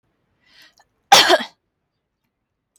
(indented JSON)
{
  "cough_length": "2.8 s",
  "cough_amplitude": 32656,
  "cough_signal_mean_std_ratio": 0.24,
  "survey_phase": "alpha (2021-03-01 to 2021-08-12)",
  "age": "18-44",
  "gender": "Female",
  "wearing_mask": "No",
  "symptom_none": true,
  "smoker_status": "Never smoked",
  "respiratory_condition_asthma": true,
  "respiratory_condition_other": false,
  "recruitment_source": "REACT",
  "submission_delay": "2 days",
  "covid_test_result": "Negative",
  "covid_test_method": "RT-qPCR"
}